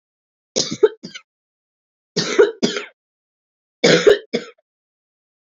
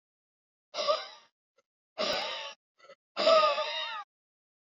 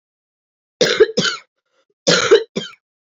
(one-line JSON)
{"three_cough_length": "5.5 s", "three_cough_amplitude": 28236, "three_cough_signal_mean_std_ratio": 0.32, "exhalation_length": "4.6 s", "exhalation_amplitude": 8651, "exhalation_signal_mean_std_ratio": 0.42, "cough_length": "3.1 s", "cough_amplitude": 30287, "cough_signal_mean_std_ratio": 0.39, "survey_phase": "beta (2021-08-13 to 2022-03-07)", "age": "18-44", "gender": "Female", "wearing_mask": "No", "symptom_cough_any": true, "symptom_runny_or_blocked_nose": true, "symptom_sore_throat": true, "symptom_fever_high_temperature": true, "symptom_headache": true, "smoker_status": "Ex-smoker", "respiratory_condition_asthma": false, "respiratory_condition_other": false, "recruitment_source": "Test and Trace", "submission_delay": "2 days", "covid_test_result": "Positive", "covid_test_method": "LFT"}